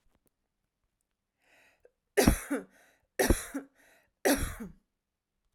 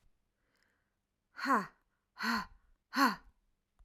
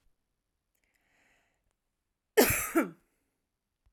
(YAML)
three_cough_length: 5.5 s
three_cough_amplitude: 13855
three_cough_signal_mean_std_ratio: 0.3
exhalation_length: 3.8 s
exhalation_amplitude: 5524
exhalation_signal_mean_std_ratio: 0.33
cough_length: 3.9 s
cough_amplitude: 12636
cough_signal_mean_std_ratio: 0.24
survey_phase: beta (2021-08-13 to 2022-03-07)
age: 18-44
gender: Female
wearing_mask: 'No'
symptom_headache: true
smoker_status: Never smoked
respiratory_condition_asthma: false
respiratory_condition_other: false
recruitment_source: REACT
submission_delay: 1 day
covid_test_result: Negative
covid_test_method: RT-qPCR